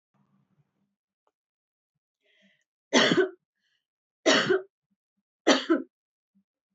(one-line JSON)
{"three_cough_length": "6.7 s", "three_cough_amplitude": 15660, "three_cough_signal_mean_std_ratio": 0.29, "survey_phase": "beta (2021-08-13 to 2022-03-07)", "age": "45-64", "gender": "Female", "wearing_mask": "No", "symptom_none": true, "smoker_status": "Never smoked", "respiratory_condition_asthma": false, "respiratory_condition_other": false, "recruitment_source": "REACT", "submission_delay": "3 days", "covid_test_result": "Negative", "covid_test_method": "RT-qPCR", "influenza_a_test_result": "Negative", "influenza_b_test_result": "Negative"}